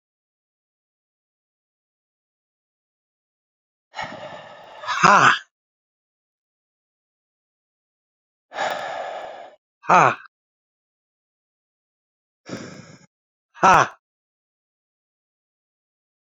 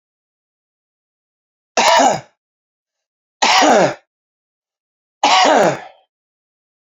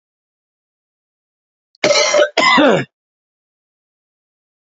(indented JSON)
{
  "exhalation_length": "16.3 s",
  "exhalation_amplitude": 32054,
  "exhalation_signal_mean_std_ratio": 0.21,
  "three_cough_length": "7.0 s",
  "three_cough_amplitude": 30710,
  "three_cough_signal_mean_std_ratio": 0.38,
  "cough_length": "4.7 s",
  "cough_amplitude": 29185,
  "cough_signal_mean_std_ratio": 0.36,
  "survey_phase": "beta (2021-08-13 to 2022-03-07)",
  "age": "45-64",
  "gender": "Male",
  "wearing_mask": "No",
  "symptom_cough_any": true,
  "symptom_headache": true,
  "symptom_change_to_sense_of_smell_or_taste": true,
  "symptom_loss_of_taste": true,
  "symptom_onset": "4 days",
  "smoker_status": "Ex-smoker",
  "respiratory_condition_asthma": false,
  "respiratory_condition_other": false,
  "recruitment_source": "Test and Trace",
  "submission_delay": "3 days",
  "covid_test_result": "Positive",
  "covid_test_method": "RT-qPCR"
}